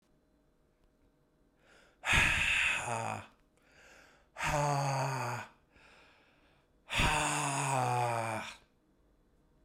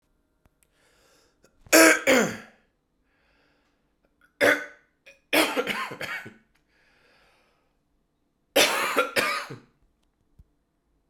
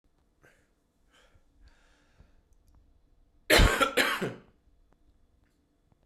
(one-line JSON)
{"exhalation_length": "9.6 s", "exhalation_amplitude": 6851, "exhalation_signal_mean_std_ratio": 0.55, "three_cough_length": "11.1 s", "three_cough_amplitude": 27341, "three_cough_signal_mean_std_ratio": 0.32, "cough_length": "6.1 s", "cough_amplitude": 15454, "cough_signal_mean_std_ratio": 0.26, "survey_phase": "beta (2021-08-13 to 2022-03-07)", "age": "18-44", "gender": "Male", "wearing_mask": "No", "symptom_cough_any": true, "symptom_runny_or_blocked_nose": true, "symptom_shortness_of_breath": true, "symptom_sore_throat": true, "symptom_fatigue": true, "symptom_change_to_sense_of_smell_or_taste": true, "symptom_onset": "4 days", "smoker_status": "Never smoked", "respiratory_condition_asthma": true, "respiratory_condition_other": false, "recruitment_source": "Test and Trace", "submission_delay": "1 day", "covid_test_result": "Positive", "covid_test_method": "RT-qPCR", "covid_ct_value": 16.4, "covid_ct_gene": "N gene"}